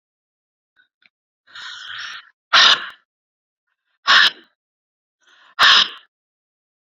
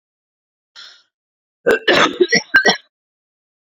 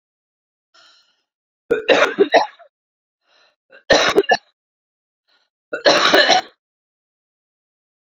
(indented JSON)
{
  "exhalation_length": "6.8 s",
  "exhalation_amplitude": 31575,
  "exhalation_signal_mean_std_ratio": 0.29,
  "cough_length": "3.8 s",
  "cough_amplitude": 31158,
  "cough_signal_mean_std_ratio": 0.36,
  "three_cough_length": "8.0 s",
  "three_cough_amplitude": 32217,
  "three_cough_signal_mean_std_ratio": 0.35,
  "survey_phase": "beta (2021-08-13 to 2022-03-07)",
  "age": "45-64",
  "gender": "Female",
  "wearing_mask": "No",
  "symptom_cough_any": true,
  "symptom_runny_or_blocked_nose": true,
  "smoker_status": "Current smoker (11 or more cigarettes per day)",
  "respiratory_condition_asthma": false,
  "respiratory_condition_other": true,
  "recruitment_source": "REACT",
  "submission_delay": "1 day",
  "covid_test_result": "Negative",
  "covid_test_method": "RT-qPCR"
}